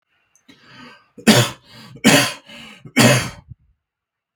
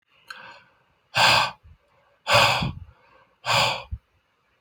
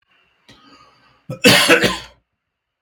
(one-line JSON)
{"three_cough_length": "4.4 s", "three_cough_amplitude": 32768, "three_cough_signal_mean_std_ratio": 0.36, "exhalation_length": "4.6 s", "exhalation_amplitude": 22276, "exhalation_signal_mean_std_ratio": 0.41, "cough_length": "2.8 s", "cough_amplitude": 32768, "cough_signal_mean_std_ratio": 0.35, "survey_phase": "beta (2021-08-13 to 2022-03-07)", "age": "45-64", "gender": "Male", "wearing_mask": "No", "symptom_cough_any": true, "smoker_status": "Never smoked", "respiratory_condition_asthma": false, "respiratory_condition_other": false, "recruitment_source": "REACT", "submission_delay": "3 days", "covid_test_result": "Negative", "covid_test_method": "RT-qPCR", "influenza_a_test_result": "Negative", "influenza_b_test_result": "Negative"}